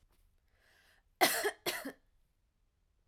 cough_length: 3.1 s
cough_amplitude: 8372
cough_signal_mean_std_ratio: 0.29
survey_phase: alpha (2021-03-01 to 2021-08-12)
age: 18-44
gender: Female
wearing_mask: 'No'
symptom_headache: true
smoker_status: Ex-smoker
respiratory_condition_asthma: false
respiratory_condition_other: false
recruitment_source: REACT
submission_delay: 2 days
covid_test_result: Negative
covid_test_method: RT-qPCR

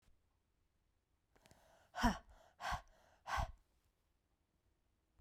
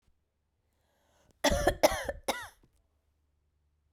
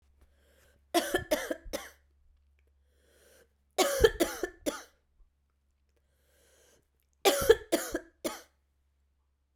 exhalation_length: 5.2 s
exhalation_amplitude: 3069
exhalation_signal_mean_std_ratio: 0.27
cough_length: 3.9 s
cough_amplitude: 11618
cough_signal_mean_std_ratio: 0.29
three_cough_length: 9.6 s
three_cough_amplitude: 13912
three_cough_signal_mean_std_ratio: 0.29
survey_phase: beta (2021-08-13 to 2022-03-07)
age: 18-44
gender: Female
wearing_mask: 'No'
symptom_cough_any: true
symptom_runny_or_blocked_nose: true
symptom_sore_throat: true
symptom_fatigue: true
symptom_headache: true
symptom_change_to_sense_of_smell_or_taste: true
symptom_onset: 3 days
smoker_status: Never smoked
respiratory_condition_asthma: false
respiratory_condition_other: false
recruitment_source: Test and Trace
submission_delay: 2 days
covid_test_result: Positive
covid_test_method: RT-qPCR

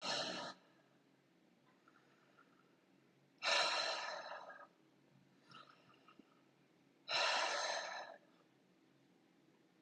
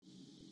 exhalation_length: 9.8 s
exhalation_amplitude: 2540
exhalation_signal_mean_std_ratio: 0.43
cough_length: 0.5 s
cough_amplitude: 179
cough_signal_mean_std_ratio: 1.18
survey_phase: beta (2021-08-13 to 2022-03-07)
age: 45-64
gender: Female
wearing_mask: 'No'
symptom_none: true
smoker_status: Ex-smoker
respiratory_condition_asthma: false
respiratory_condition_other: false
recruitment_source: Test and Trace
submission_delay: 2 days
covid_test_result: Negative
covid_test_method: RT-qPCR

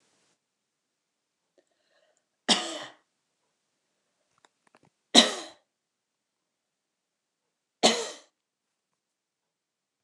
three_cough_length: 10.0 s
three_cough_amplitude: 28684
three_cough_signal_mean_std_ratio: 0.17
survey_phase: beta (2021-08-13 to 2022-03-07)
age: 65+
gender: Female
wearing_mask: 'No'
symptom_none: true
smoker_status: Ex-smoker
respiratory_condition_asthma: false
respiratory_condition_other: false
recruitment_source: REACT
submission_delay: 1 day
covid_test_result: Negative
covid_test_method: RT-qPCR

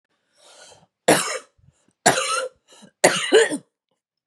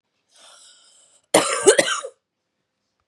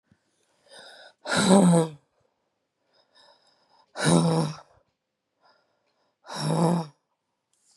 three_cough_length: 4.3 s
three_cough_amplitude: 32767
three_cough_signal_mean_std_ratio: 0.38
cough_length: 3.1 s
cough_amplitude: 32705
cough_signal_mean_std_ratio: 0.31
exhalation_length: 7.8 s
exhalation_amplitude: 23449
exhalation_signal_mean_std_ratio: 0.38
survey_phase: beta (2021-08-13 to 2022-03-07)
age: 45-64
gender: Female
wearing_mask: 'No'
symptom_cough_any: true
symptom_runny_or_blocked_nose: true
symptom_shortness_of_breath: true
symptom_sore_throat: true
symptom_fatigue: true
symptom_fever_high_temperature: true
symptom_headache: true
symptom_change_to_sense_of_smell_or_taste: true
symptom_onset: 2 days
smoker_status: Ex-smoker
respiratory_condition_asthma: false
respiratory_condition_other: false
recruitment_source: Test and Trace
submission_delay: 1 day
covid_test_result: Positive
covid_test_method: RT-qPCR
covid_ct_value: 30.1
covid_ct_gene: ORF1ab gene
covid_ct_mean: 30.3
covid_viral_load: 110 copies/ml
covid_viral_load_category: Minimal viral load (< 10K copies/ml)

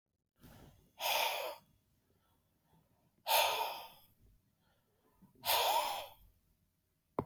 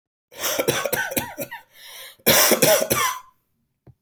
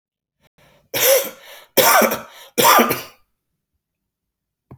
exhalation_length: 7.3 s
exhalation_amplitude: 4340
exhalation_signal_mean_std_ratio: 0.4
cough_length: 4.0 s
cough_amplitude: 25761
cough_signal_mean_std_ratio: 0.52
three_cough_length: 4.8 s
three_cough_amplitude: 32768
three_cough_signal_mean_std_ratio: 0.4
survey_phase: alpha (2021-03-01 to 2021-08-12)
age: 45-64
gender: Male
wearing_mask: 'No'
symptom_cough_any: true
symptom_onset: 12 days
smoker_status: Current smoker (1 to 10 cigarettes per day)
respiratory_condition_asthma: false
respiratory_condition_other: false
recruitment_source: REACT
submission_delay: 3 days
covid_test_result: Negative
covid_test_method: RT-qPCR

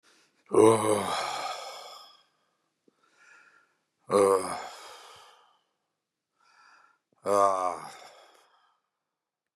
exhalation_length: 9.6 s
exhalation_amplitude: 13050
exhalation_signal_mean_std_ratio: 0.34
survey_phase: beta (2021-08-13 to 2022-03-07)
age: 45-64
gender: Male
wearing_mask: 'No'
symptom_cough_any: true
symptom_shortness_of_breath: true
symptom_fatigue: true
symptom_onset: 12 days
smoker_status: Ex-smoker
respiratory_condition_asthma: false
respiratory_condition_other: false
recruitment_source: REACT
submission_delay: -1 day
covid_test_result: Negative
covid_test_method: RT-qPCR
influenza_a_test_result: Negative
influenza_b_test_result: Negative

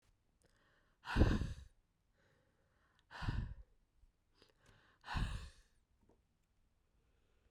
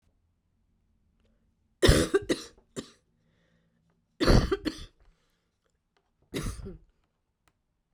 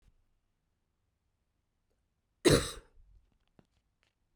exhalation_length: 7.5 s
exhalation_amplitude: 3948
exhalation_signal_mean_std_ratio: 0.29
three_cough_length: 7.9 s
three_cough_amplitude: 17650
three_cough_signal_mean_std_ratio: 0.27
cough_length: 4.4 s
cough_amplitude: 8895
cough_signal_mean_std_ratio: 0.18
survey_phase: beta (2021-08-13 to 2022-03-07)
age: 45-64
gender: Female
wearing_mask: 'No'
symptom_cough_any: true
symptom_runny_or_blocked_nose: true
symptom_shortness_of_breath: true
symptom_change_to_sense_of_smell_or_taste: true
smoker_status: Never smoked
respiratory_condition_asthma: false
respiratory_condition_other: false
recruitment_source: Test and Trace
submission_delay: 1 day
covid_test_result: Negative
covid_test_method: LFT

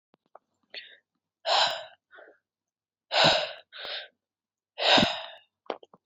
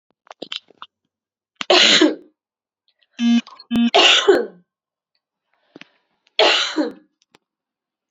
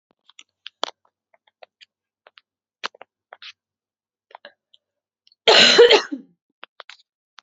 exhalation_length: 6.1 s
exhalation_amplitude: 14776
exhalation_signal_mean_std_ratio: 0.36
three_cough_length: 8.1 s
three_cough_amplitude: 29854
three_cough_signal_mean_std_ratio: 0.39
cough_length: 7.4 s
cough_amplitude: 31223
cough_signal_mean_std_ratio: 0.23
survey_phase: beta (2021-08-13 to 2022-03-07)
age: 18-44
gender: Female
wearing_mask: 'No'
symptom_none: true
smoker_status: Current smoker (e-cigarettes or vapes only)
respiratory_condition_asthma: false
respiratory_condition_other: false
recruitment_source: Test and Trace
submission_delay: 2 days
covid_test_result: Positive
covid_test_method: LFT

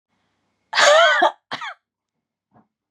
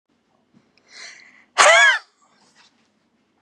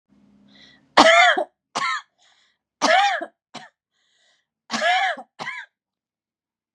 cough_length: 2.9 s
cough_amplitude: 28282
cough_signal_mean_std_ratio: 0.39
exhalation_length: 3.4 s
exhalation_amplitude: 32767
exhalation_signal_mean_std_ratio: 0.29
three_cough_length: 6.7 s
three_cough_amplitude: 32768
three_cough_signal_mean_std_ratio: 0.37
survey_phase: beta (2021-08-13 to 2022-03-07)
age: 18-44
gender: Female
wearing_mask: 'No'
symptom_none: true
symptom_onset: 4 days
smoker_status: Never smoked
respiratory_condition_asthma: true
respiratory_condition_other: false
recruitment_source: Test and Trace
submission_delay: 2 days
covid_test_result: Negative
covid_test_method: RT-qPCR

